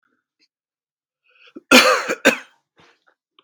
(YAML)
cough_length: 3.4 s
cough_amplitude: 32768
cough_signal_mean_std_ratio: 0.28
survey_phase: beta (2021-08-13 to 2022-03-07)
age: 45-64
gender: Male
wearing_mask: 'No'
symptom_cough_any: true
symptom_runny_or_blocked_nose: true
symptom_shortness_of_breath: true
symptom_onset: 4 days
smoker_status: Never smoked
respiratory_condition_asthma: false
respiratory_condition_other: false
recruitment_source: Test and Trace
submission_delay: 1 day
covid_test_result: Positive
covid_test_method: RT-qPCR
covid_ct_value: 23.4
covid_ct_gene: N gene